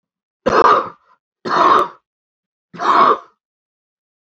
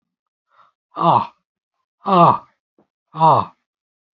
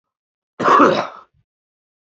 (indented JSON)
{
  "three_cough_length": "4.3 s",
  "three_cough_amplitude": 29152,
  "three_cough_signal_mean_std_ratio": 0.43,
  "exhalation_length": "4.2 s",
  "exhalation_amplitude": 29747,
  "exhalation_signal_mean_std_ratio": 0.35,
  "cough_length": "2.0 s",
  "cough_amplitude": 28077,
  "cough_signal_mean_std_ratio": 0.38,
  "survey_phase": "beta (2021-08-13 to 2022-03-07)",
  "age": "65+",
  "gender": "Male",
  "wearing_mask": "No",
  "symptom_abdominal_pain": true,
  "symptom_fatigue": true,
  "symptom_headache": true,
  "symptom_other": true,
  "smoker_status": "Current smoker (1 to 10 cigarettes per day)",
  "respiratory_condition_asthma": false,
  "respiratory_condition_other": true,
  "recruitment_source": "Test and Trace",
  "submission_delay": "2 days",
  "covid_test_result": "Positive",
  "covid_test_method": "LFT"
}